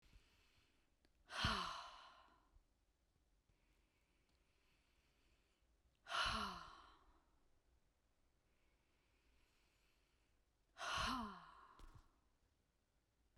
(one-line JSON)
{"exhalation_length": "13.4 s", "exhalation_amplitude": 1595, "exhalation_signal_mean_std_ratio": 0.33, "survey_phase": "beta (2021-08-13 to 2022-03-07)", "age": "18-44", "gender": "Female", "wearing_mask": "No", "symptom_runny_or_blocked_nose": true, "smoker_status": "Ex-smoker", "respiratory_condition_asthma": false, "respiratory_condition_other": false, "recruitment_source": "REACT", "submission_delay": "1 day", "covid_test_result": "Negative", "covid_test_method": "RT-qPCR", "influenza_a_test_result": "Unknown/Void", "influenza_b_test_result": "Unknown/Void"}